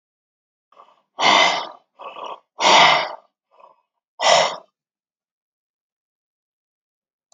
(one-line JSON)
{"exhalation_length": "7.3 s", "exhalation_amplitude": 29370, "exhalation_signal_mean_std_ratio": 0.33, "survey_phase": "beta (2021-08-13 to 2022-03-07)", "age": "18-44", "gender": "Male", "wearing_mask": "No", "symptom_none": true, "smoker_status": "Never smoked", "respiratory_condition_asthma": false, "respiratory_condition_other": false, "recruitment_source": "REACT", "submission_delay": "3 days", "covid_test_result": "Negative", "covid_test_method": "RT-qPCR"}